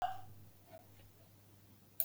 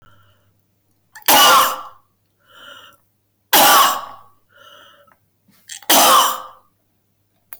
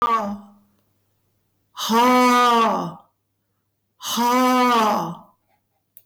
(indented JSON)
{
  "cough_length": "2.0 s",
  "cough_amplitude": 6252,
  "cough_signal_mean_std_ratio": 0.39,
  "three_cough_length": "7.6 s",
  "three_cough_amplitude": 24394,
  "three_cough_signal_mean_std_ratio": 0.41,
  "exhalation_length": "6.1 s",
  "exhalation_amplitude": 12047,
  "exhalation_signal_mean_std_ratio": 0.64,
  "survey_phase": "beta (2021-08-13 to 2022-03-07)",
  "age": "65+",
  "gender": "Female",
  "wearing_mask": "No",
  "symptom_runny_or_blocked_nose": true,
  "smoker_status": "Never smoked",
  "respiratory_condition_asthma": false,
  "respiratory_condition_other": false,
  "recruitment_source": "REACT",
  "submission_delay": "1 day",
  "covid_test_result": "Negative",
  "covid_test_method": "RT-qPCR"
}